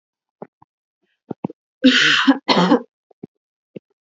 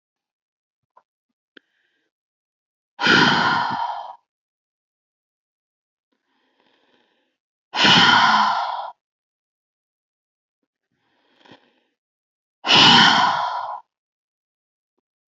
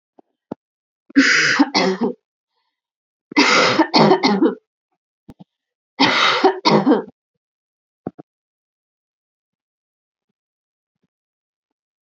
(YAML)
cough_length: 4.0 s
cough_amplitude: 29078
cough_signal_mean_std_ratio: 0.37
exhalation_length: 15.3 s
exhalation_amplitude: 30852
exhalation_signal_mean_std_ratio: 0.34
three_cough_length: 12.0 s
three_cough_amplitude: 31260
three_cough_signal_mean_std_ratio: 0.39
survey_phase: beta (2021-08-13 to 2022-03-07)
age: 18-44
gender: Female
wearing_mask: 'No'
symptom_runny_or_blocked_nose: true
symptom_headache: true
smoker_status: Ex-smoker
respiratory_condition_asthma: false
respiratory_condition_other: false
recruitment_source: REACT
submission_delay: 2 days
covid_test_result: Negative
covid_test_method: RT-qPCR
influenza_a_test_result: Negative
influenza_b_test_result: Negative